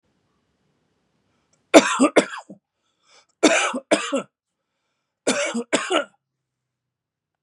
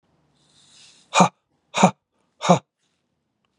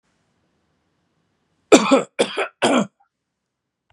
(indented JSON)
{
  "three_cough_length": "7.4 s",
  "three_cough_amplitude": 32768,
  "three_cough_signal_mean_std_ratio": 0.32,
  "exhalation_length": "3.6 s",
  "exhalation_amplitude": 32734,
  "exhalation_signal_mean_std_ratio": 0.25,
  "cough_length": "3.9 s",
  "cough_amplitude": 32768,
  "cough_signal_mean_std_ratio": 0.3,
  "survey_phase": "beta (2021-08-13 to 2022-03-07)",
  "age": "45-64",
  "gender": "Male",
  "wearing_mask": "No",
  "symptom_none": true,
  "smoker_status": "Ex-smoker",
  "respiratory_condition_asthma": false,
  "respiratory_condition_other": false,
  "recruitment_source": "REACT",
  "submission_delay": "3 days",
  "covid_test_result": "Negative",
  "covid_test_method": "RT-qPCR",
  "influenza_a_test_result": "Negative",
  "influenza_b_test_result": "Negative"
}